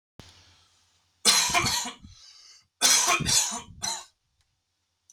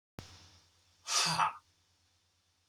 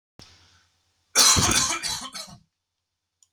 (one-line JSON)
{"three_cough_length": "5.1 s", "three_cough_amplitude": 19843, "three_cough_signal_mean_std_ratio": 0.44, "exhalation_length": "2.7 s", "exhalation_amplitude": 5010, "exhalation_signal_mean_std_ratio": 0.36, "cough_length": "3.3 s", "cough_amplitude": 23118, "cough_signal_mean_std_ratio": 0.39, "survey_phase": "beta (2021-08-13 to 2022-03-07)", "age": "18-44", "gender": "Male", "wearing_mask": "No", "symptom_none": true, "symptom_onset": "3 days", "smoker_status": "Never smoked", "respiratory_condition_asthma": false, "respiratory_condition_other": false, "recruitment_source": "REACT", "submission_delay": "3 days", "covid_test_result": "Negative", "covid_test_method": "RT-qPCR", "influenza_a_test_result": "Negative", "influenza_b_test_result": "Negative"}